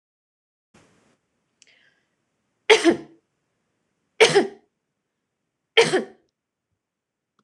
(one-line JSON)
{"three_cough_length": "7.4 s", "three_cough_amplitude": 26028, "three_cough_signal_mean_std_ratio": 0.23, "survey_phase": "beta (2021-08-13 to 2022-03-07)", "age": "18-44", "gender": "Female", "wearing_mask": "No", "symptom_none": true, "smoker_status": "Prefer not to say", "respiratory_condition_asthma": false, "respiratory_condition_other": false, "recruitment_source": "REACT", "submission_delay": "9 days", "covid_test_result": "Negative", "covid_test_method": "RT-qPCR"}